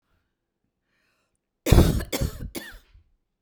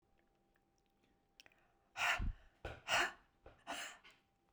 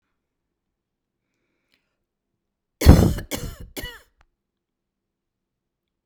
{
  "cough_length": "3.4 s",
  "cough_amplitude": 26192,
  "cough_signal_mean_std_ratio": 0.29,
  "exhalation_length": "4.5 s",
  "exhalation_amplitude": 2572,
  "exhalation_signal_mean_std_ratio": 0.36,
  "three_cough_length": "6.1 s",
  "three_cough_amplitude": 32768,
  "three_cough_signal_mean_std_ratio": 0.19,
  "survey_phase": "beta (2021-08-13 to 2022-03-07)",
  "age": "45-64",
  "gender": "Female",
  "wearing_mask": "No",
  "symptom_none": true,
  "smoker_status": "Never smoked",
  "respiratory_condition_asthma": false,
  "respiratory_condition_other": false,
  "recruitment_source": "REACT",
  "submission_delay": "2 days",
  "covid_test_result": "Negative",
  "covid_test_method": "RT-qPCR"
}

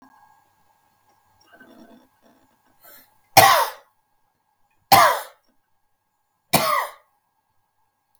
{
  "three_cough_length": "8.2 s",
  "three_cough_amplitude": 32768,
  "three_cough_signal_mean_std_ratio": 0.25,
  "survey_phase": "beta (2021-08-13 to 2022-03-07)",
  "age": "65+",
  "gender": "Male",
  "wearing_mask": "No",
  "symptom_none": true,
  "smoker_status": "Never smoked",
  "respiratory_condition_asthma": true,
  "respiratory_condition_other": false,
  "recruitment_source": "REACT",
  "submission_delay": "2 days",
  "covid_test_result": "Negative",
  "covid_test_method": "RT-qPCR",
  "influenza_a_test_result": "Negative",
  "influenza_b_test_result": "Negative"
}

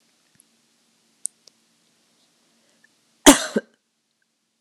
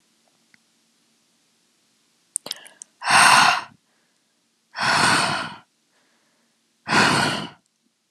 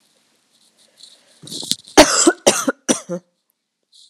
{
  "cough_length": "4.6 s",
  "cough_amplitude": 32768,
  "cough_signal_mean_std_ratio": 0.14,
  "exhalation_length": "8.1 s",
  "exhalation_amplitude": 30889,
  "exhalation_signal_mean_std_ratio": 0.37,
  "three_cough_length": "4.1 s",
  "three_cough_amplitude": 32768,
  "three_cough_signal_mean_std_ratio": 0.3,
  "survey_phase": "beta (2021-08-13 to 2022-03-07)",
  "age": "18-44",
  "gender": "Female",
  "wearing_mask": "No",
  "symptom_cough_any": true,
  "symptom_sore_throat": true,
  "symptom_diarrhoea": true,
  "symptom_fatigue": true,
  "symptom_headache": true,
  "smoker_status": "Ex-smoker",
  "respiratory_condition_asthma": false,
  "respiratory_condition_other": false,
  "recruitment_source": "Test and Trace",
  "submission_delay": "2 days",
  "covid_test_result": "Positive",
  "covid_test_method": "LFT"
}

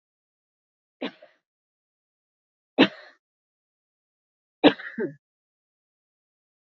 {
  "three_cough_length": "6.7 s",
  "three_cough_amplitude": 27446,
  "three_cough_signal_mean_std_ratio": 0.16,
  "survey_phase": "beta (2021-08-13 to 2022-03-07)",
  "age": "45-64",
  "gender": "Female",
  "wearing_mask": "No",
  "symptom_none": true,
  "smoker_status": "Ex-smoker",
  "respiratory_condition_asthma": false,
  "respiratory_condition_other": false,
  "recruitment_source": "REACT",
  "submission_delay": "2 days",
  "covid_test_result": "Negative",
  "covid_test_method": "RT-qPCR",
  "influenza_a_test_result": "Unknown/Void",
  "influenza_b_test_result": "Unknown/Void"
}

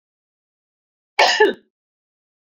{
  "cough_length": "2.6 s",
  "cough_amplitude": 29622,
  "cough_signal_mean_std_ratio": 0.27,
  "survey_phase": "beta (2021-08-13 to 2022-03-07)",
  "age": "45-64",
  "gender": "Female",
  "wearing_mask": "No",
  "symptom_shortness_of_breath": true,
  "symptom_fatigue": true,
  "smoker_status": "Never smoked",
  "respiratory_condition_asthma": false,
  "respiratory_condition_other": false,
  "recruitment_source": "REACT",
  "submission_delay": "2 days",
  "covid_test_result": "Negative",
  "covid_test_method": "RT-qPCR"
}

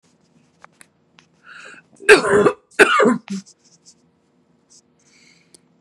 {
  "cough_length": "5.8 s",
  "cough_amplitude": 32768,
  "cough_signal_mean_std_ratio": 0.3,
  "survey_phase": "beta (2021-08-13 to 2022-03-07)",
  "age": "45-64",
  "gender": "Female",
  "wearing_mask": "No",
  "symptom_cough_any": true,
  "symptom_runny_or_blocked_nose": true,
  "symptom_sore_throat": true,
  "symptom_headache": true,
  "symptom_onset": "7 days",
  "smoker_status": "Ex-smoker",
  "respiratory_condition_asthma": true,
  "respiratory_condition_other": false,
  "recruitment_source": "Test and Trace",
  "submission_delay": "2 days",
  "covid_test_result": "Positive",
  "covid_test_method": "RT-qPCR",
  "covid_ct_value": 30.5,
  "covid_ct_gene": "ORF1ab gene"
}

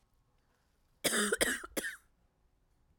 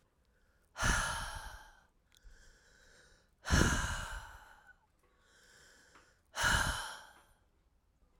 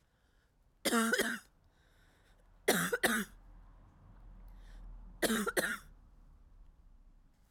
{
  "cough_length": "3.0 s",
  "cough_amplitude": 8081,
  "cough_signal_mean_std_ratio": 0.38,
  "exhalation_length": "8.2 s",
  "exhalation_amplitude": 6019,
  "exhalation_signal_mean_std_ratio": 0.39,
  "three_cough_length": "7.5 s",
  "three_cough_amplitude": 5425,
  "three_cough_signal_mean_std_ratio": 0.42,
  "survey_phase": "alpha (2021-03-01 to 2021-08-12)",
  "age": "45-64",
  "gender": "Female",
  "wearing_mask": "No",
  "symptom_cough_any": true,
  "symptom_new_continuous_cough": true,
  "symptom_fatigue": true,
  "symptom_fever_high_temperature": true,
  "symptom_change_to_sense_of_smell_or_taste": true,
  "symptom_loss_of_taste": true,
  "smoker_status": "Never smoked",
  "respiratory_condition_asthma": false,
  "respiratory_condition_other": false,
  "recruitment_source": "Test and Trace",
  "submission_delay": "2 days",
  "covid_test_result": "Positive",
  "covid_test_method": "RT-qPCR",
  "covid_ct_value": 14.0,
  "covid_ct_gene": "ORF1ab gene",
  "covid_ct_mean": 14.3,
  "covid_viral_load": "20000000 copies/ml",
  "covid_viral_load_category": "High viral load (>1M copies/ml)"
}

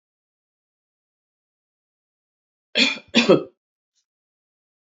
{
  "cough_length": "4.9 s",
  "cough_amplitude": 27224,
  "cough_signal_mean_std_ratio": 0.22,
  "survey_phase": "beta (2021-08-13 to 2022-03-07)",
  "age": "65+",
  "gender": "Female",
  "wearing_mask": "No",
  "symptom_cough_any": true,
  "symptom_runny_or_blocked_nose": true,
  "symptom_headache": true,
  "symptom_onset": "3 days",
  "smoker_status": "Ex-smoker",
  "respiratory_condition_asthma": false,
  "respiratory_condition_other": false,
  "recruitment_source": "Test and Trace",
  "submission_delay": "2 days",
  "covid_test_result": "Positive",
  "covid_test_method": "RT-qPCR",
  "covid_ct_value": 24.6,
  "covid_ct_gene": "N gene"
}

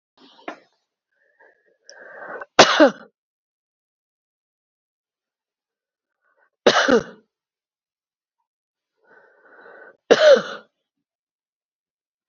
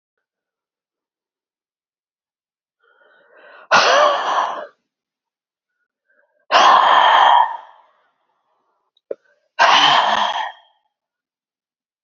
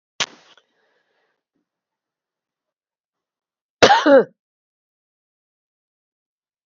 {
  "three_cough_length": "12.3 s",
  "three_cough_amplitude": 32768,
  "three_cough_signal_mean_std_ratio": 0.22,
  "exhalation_length": "12.0 s",
  "exhalation_amplitude": 32767,
  "exhalation_signal_mean_std_ratio": 0.39,
  "cough_length": "6.7 s",
  "cough_amplitude": 30169,
  "cough_signal_mean_std_ratio": 0.2,
  "survey_phase": "beta (2021-08-13 to 2022-03-07)",
  "age": "65+",
  "gender": "Female",
  "wearing_mask": "No",
  "symptom_none": true,
  "smoker_status": "Ex-smoker",
  "respiratory_condition_asthma": false,
  "respiratory_condition_other": false,
  "recruitment_source": "REACT",
  "submission_delay": "3 days",
  "covid_test_result": "Negative",
  "covid_test_method": "RT-qPCR",
  "influenza_a_test_result": "Negative",
  "influenza_b_test_result": "Negative"
}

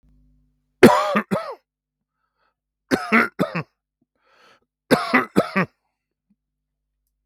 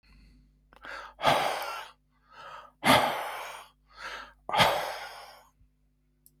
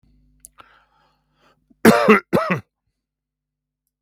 {
  "three_cough_length": "7.3 s",
  "three_cough_amplitude": 32767,
  "three_cough_signal_mean_std_ratio": 0.31,
  "exhalation_length": "6.4 s",
  "exhalation_amplitude": 14950,
  "exhalation_signal_mean_std_ratio": 0.41,
  "cough_length": "4.0 s",
  "cough_amplitude": 32766,
  "cough_signal_mean_std_ratio": 0.27,
  "survey_phase": "beta (2021-08-13 to 2022-03-07)",
  "age": "65+",
  "gender": "Male",
  "wearing_mask": "No",
  "symptom_fatigue": true,
  "smoker_status": "Never smoked",
  "respiratory_condition_asthma": false,
  "respiratory_condition_other": false,
  "recruitment_source": "REACT",
  "submission_delay": "1 day",
  "covid_test_result": "Negative",
  "covid_test_method": "RT-qPCR",
  "influenza_a_test_result": "Unknown/Void",
  "influenza_b_test_result": "Unknown/Void"
}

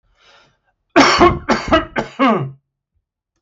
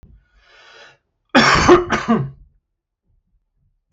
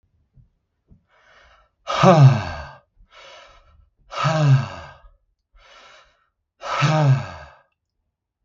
{
  "three_cough_length": "3.4 s",
  "three_cough_amplitude": 32766,
  "three_cough_signal_mean_std_ratio": 0.45,
  "cough_length": "3.9 s",
  "cough_amplitude": 32766,
  "cough_signal_mean_std_ratio": 0.36,
  "exhalation_length": "8.4 s",
  "exhalation_amplitude": 32636,
  "exhalation_signal_mean_std_ratio": 0.36,
  "survey_phase": "beta (2021-08-13 to 2022-03-07)",
  "age": "45-64",
  "gender": "Male",
  "wearing_mask": "No",
  "symptom_none": true,
  "smoker_status": "Ex-smoker",
  "respiratory_condition_asthma": false,
  "respiratory_condition_other": false,
  "recruitment_source": "REACT",
  "submission_delay": "0 days",
  "covid_test_result": "Negative",
  "covid_test_method": "RT-qPCR"
}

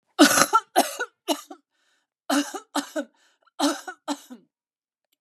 {
  "three_cough_length": "5.2 s",
  "three_cough_amplitude": 32767,
  "three_cough_signal_mean_std_ratio": 0.36,
  "survey_phase": "beta (2021-08-13 to 2022-03-07)",
  "age": "45-64",
  "gender": "Female",
  "wearing_mask": "No",
  "symptom_none": true,
  "smoker_status": "Never smoked",
  "respiratory_condition_asthma": false,
  "respiratory_condition_other": false,
  "recruitment_source": "REACT",
  "submission_delay": "6 days",
  "covid_test_result": "Negative",
  "covid_test_method": "RT-qPCR",
  "influenza_a_test_result": "Negative",
  "influenza_b_test_result": "Negative"
}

